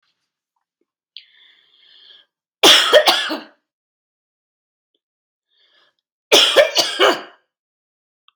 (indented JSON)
{
  "cough_length": "8.4 s",
  "cough_amplitude": 32768,
  "cough_signal_mean_std_ratio": 0.31,
  "survey_phase": "beta (2021-08-13 to 2022-03-07)",
  "age": "45-64",
  "gender": "Female",
  "wearing_mask": "No",
  "symptom_runny_or_blocked_nose": true,
  "smoker_status": "Never smoked",
  "respiratory_condition_asthma": false,
  "respiratory_condition_other": false,
  "recruitment_source": "REACT",
  "submission_delay": "1 day",
  "covid_test_result": "Negative",
  "covid_test_method": "RT-qPCR",
  "influenza_a_test_result": "Negative",
  "influenza_b_test_result": "Negative"
}